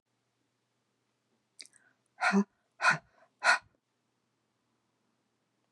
exhalation_length: 5.7 s
exhalation_amplitude: 7960
exhalation_signal_mean_std_ratio: 0.24
survey_phase: beta (2021-08-13 to 2022-03-07)
age: 45-64
gender: Female
wearing_mask: 'No'
symptom_cough_any: true
symptom_sore_throat: true
smoker_status: Never smoked
respiratory_condition_asthma: false
respiratory_condition_other: false
recruitment_source: Test and Trace
submission_delay: 1 day
covid_test_result: Negative
covid_test_method: LFT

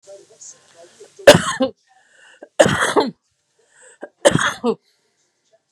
three_cough_length: 5.7 s
three_cough_amplitude: 32768
three_cough_signal_mean_std_ratio: 0.31
survey_phase: beta (2021-08-13 to 2022-03-07)
age: 45-64
gender: Female
wearing_mask: 'No'
symptom_sore_throat: true
symptom_headache: true
smoker_status: Ex-smoker
respiratory_condition_asthma: false
respiratory_condition_other: false
recruitment_source: REACT
submission_delay: 2 days
covid_test_result: Negative
covid_test_method: RT-qPCR
influenza_a_test_result: Negative
influenza_b_test_result: Negative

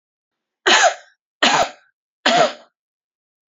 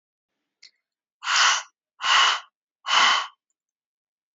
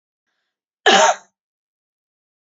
three_cough_length: 3.5 s
three_cough_amplitude: 29961
three_cough_signal_mean_std_ratio: 0.39
exhalation_length: 4.4 s
exhalation_amplitude: 20358
exhalation_signal_mean_std_ratio: 0.41
cough_length: 2.5 s
cough_amplitude: 28766
cough_signal_mean_std_ratio: 0.27
survey_phase: beta (2021-08-13 to 2022-03-07)
age: 18-44
gender: Female
wearing_mask: 'No'
symptom_cough_any: true
symptom_runny_or_blocked_nose: true
symptom_diarrhoea: true
symptom_onset: 5 days
smoker_status: Never smoked
respiratory_condition_asthma: false
respiratory_condition_other: false
recruitment_source: Test and Trace
submission_delay: 2 days
covid_test_result: Positive
covid_test_method: RT-qPCR
covid_ct_value: 25.8
covid_ct_gene: ORF1ab gene
covid_ct_mean: 25.9
covid_viral_load: 3300 copies/ml
covid_viral_load_category: Minimal viral load (< 10K copies/ml)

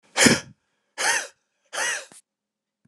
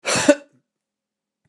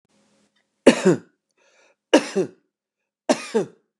exhalation_length: 2.9 s
exhalation_amplitude: 28654
exhalation_signal_mean_std_ratio: 0.37
cough_length: 1.5 s
cough_amplitude: 29075
cough_signal_mean_std_ratio: 0.3
three_cough_length: 4.0 s
three_cough_amplitude: 29204
three_cough_signal_mean_std_ratio: 0.28
survey_phase: beta (2021-08-13 to 2022-03-07)
age: 65+
gender: Male
wearing_mask: 'No'
symptom_none: true
smoker_status: Never smoked
respiratory_condition_asthma: false
respiratory_condition_other: false
recruitment_source: REACT
submission_delay: 2 days
covid_test_result: Negative
covid_test_method: RT-qPCR
influenza_a_test_result: Negative
influenza_b_test_result: Negative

